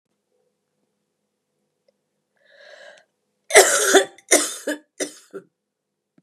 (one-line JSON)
{"cough_length": "6.2 s", "cough_amplitude": 32768, "cough_signal_mean_std_ratio": 0.26, "survey_phase": "beta (2021-08-13 to 2022-03-07)", "age": "45-64", "gender": "Female", "wearing_mask": "No", "symptom_cough_any": true, "symptom_runny_or_blocked_nose": true, "symptom_fatigue": true, "symptom_headache": true, "symptom_onset": "6 days", "smoker_status": "Never smoked", "respiratory_condition_asthma": false, "respiratory_condition_other": false, "recruitment_source": "Test and Trace", "submission_delay": "2 days", "covid_test_result": "Negative", "covid_test_method": "RT-qPCR"}